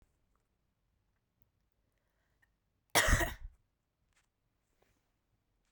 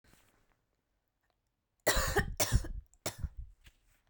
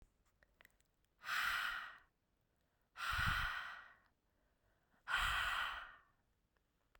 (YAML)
cough_length: 5.7 s
cough_amplitude: 7523
cough_signal_mean_std_ratio: 0.2
three_cough_length: 4.1 s
three_cough_amplitude: 6572
three_cough_signal_mean_std_ratio: 0.37
exhalation_length: 7.0 s
exhalation_amplitude: 1899
exhalation_signal_mean_std_ratio: 0.48
survey_phase: beta (2021-08-13 to 2022-03-07)
age: 18-44
gender: Female
wearing_mask: 'No'
symptom_runny_or_blocked_nose: true
symptom_fatigue: true
symptom_headache: true
symptom_other: true
symptom_onset: 6 days
smoker_status: Never smoked
respiratory_condition_asthma: false
respiratory_condition_other: false
recruitment_source: Test and Trace
submission_delay: 2 days
covid_test_result: Positive
covid_test_method: RT-qPCR
covid_ct_value: 19.9
covid_ct_gene: N gene